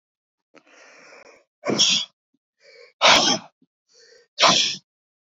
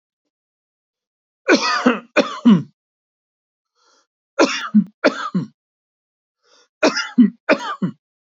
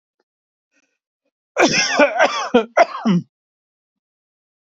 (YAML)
exhalation_length: 5.4 s
exhalation_amplitude: 26130
exhalation_signal_mean_std_ratio: 0.36
three_cough_length: 8.4 s
three_cough_amplitude: 27727
three_cough_signal_mean_std_ratio: 0.36
cough_length: 4.8 s
cough_amplitude: 28774
cough_signal_mean_std_ratio: 0.4
survey_phase: beta (2021-08-13 to 2022-03-07)
age: 45-64
gender: Male
wearing_mask: 'No'
symptom_none: true
symptom_onset: 5 days
smoker_status: Never smoked
respiratory_condition_asthma: false
respiratory_condition_other: false
recruitment_source: REACT
submission_delay: 1 day
covid_test_result: Negative
covid_test_method: RT-qPCR
influenza_a_test_result: Negative
influenza_b_test_result: Negative